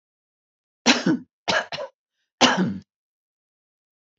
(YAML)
three_cough_length: 4.2 s
three_cough_amplitude: 30260
three_cough_signal_mean_std_ratio: 0.34
survey_phase: beta (2021-08-13 to 2022-03-07)
age: 65+
gender: Female
wearing_mask: 'No'
symptom_none: true
smoker_status: Ex-smoker
respiratory_condition_asthma: false
respiratory_condition_other: false
recruitment_source: REACT
submission_delay: 1 day
covid_test_result: Negative
covid_test_method: RT-qPCR